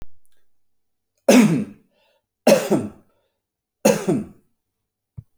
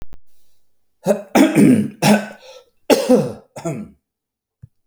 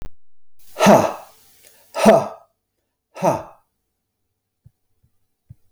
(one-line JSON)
{"three_cough_length": "5.4 s", "three_cough_amplitude": 28282, "three_cough_signal_mean_std_ratio": 0.35, "cough_length": "4.9 s", "cough_amplitude": 32272, "cough_signal_mean_std_ratio": 0.45, "exhalation_length": "5.7 s", "exhalation_amplitude": 31975, "exhalation_signal_mean_std_ratio": 0.32, "survey_phase": "alpha (2021-03-01 to 2021-08-12)", "age": "65+", "gender": "Male", "wearing_mask": "No", "symptom_none": true, "smoker_status": "Never smoked", "respiratory_condition_asthma": false, "respiratory_condition_other": false, "recruitment_source": "REACT", "submission_delay": "1 day", "covid_test_result": "Negative", "covid_test_method": "RT-qPCR", "covid_ct_value": 44.0, "covid_ct_gene": "N gene"}